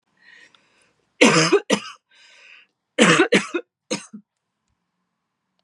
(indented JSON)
{
  "cough_length": "5.6 s",
  "cough_amplitude": 32580,
  "cough_signal_mean_std_ratio": 0.33,
  "survey_phase": "beta (2021-08-13 to 2022-03-07)",
  "age": "18-44",
  "gender": "Female",
  "wearing_mask": "No",
  "symptom_cough_any": true,
  "symptom_onset": "5 days",
  "smoker_status": "Never smoked",
  "respiratory_condition_asthma": false,
  "respiratory_condition_other": false,
  "recruitment_source": "REACT",
  "submission_delay": "2 days",
  "covid_test_result": "Negative",
  "covid_test_method": "RT-qPCR",
  "influenza_a_test_result": "Unknown/Void",
  "influenza_b_test_result": "Unknown/Void"
}